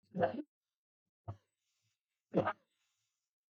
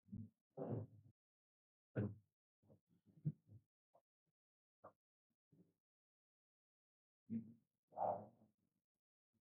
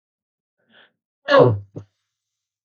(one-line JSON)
{"three_cough_length": "3.5 s", "three_cough_amplitude": 3992, "three_cough_signal_mean_std_ratio": 0.26, "exhalation_length": "9.5 s", "exhalation_amplitude": 939, "exhalation_signal_mean_std_ratio": 0.28, "cough_length": "2.6 s", "cough_amplitude": 32766, "cough_signal_mean_std_ratio": 0.27, "survey_phase": "beta (2021-08-13 to 2022-03-07)", "age": "65+", "gender": "Male", "wearing_mask": "No", "symptom_none": true, "smoker_status": "Ex-smoker", "respiratory_condition_asthma": false, "respiratory_condition_other": false, "recruitment_source": "REACT", "submission_delay": "1 day", "covid_test_result": "Negative", "covid_test_method": "RT-qPCR", "influenza_a_test_result": "Negative", "influenza_b_test_result": "Negative"}